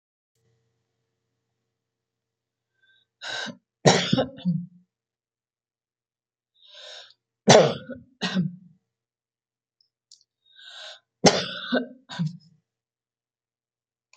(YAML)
three_cough_length: 14.2 s
three_cough_amplitude: 31697
three_cough_signal_mean_std_ratio: 0.25
survey_phase: beta (2021-08-13 to 2022-03-07)
age: 65+
gender: Female
wearing_mask: 'No'
symptom_none: true
smoker_status: Never smoked
respiratory_condition_asthma: false
respiratory_condition_other: false
recruitment_source: REACT
submission_delay: 2 days
covid_test_result: Negative
covid_test_method: RT-qPCR
influenza_a_test_result: Negative
influenza_b_test_result: Negative